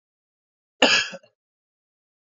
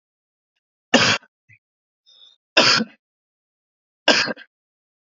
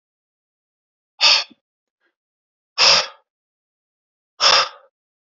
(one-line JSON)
{"cough_length": "2.3 s", "cough_amplitude": 26284, "cough_signal_mean_std_ratio": 0.25, "three_cough_length": "5.1 s", "three_cough_amplitude": 30591, "three_cough_signal_mean_std_ratio": 0.29, "exhalation_length": "5.3 s", "exhalation_amplitude": 32129, "exhalation_signal_mean_std_ratio": 0.29, "survey_phase": "beta (2021-08-13 to 2022-03-07)", "age": "18-44", "gender": "Male", "wearing_mask": "No", "symptom_cough_any": true, "symptom_runny_or_blocked_nose": true, "symptom_sore_throat": true, "symptom_fatigue": true, "symptom_fever_high_temperature": true, "symptom_headache": true, "smoker_status": "Never smoked", "respiratory_condition_asthma": false, "respiratory_condition_other": false, "recruitment_source": "Test and Trace", "submission_delay": "2 days", "covid_test_result": "Positive", "covid_test_method": "RT-qPCR", "covid_ct_value": 28.6, "covid_ct_gene": "ORF1ab gene", "covid_ct_mean": 28.9, "covid_viral_load": "340 copies/ml", "covid_viral_load_category": "Minimal viral load (< 10K copies/ml)"}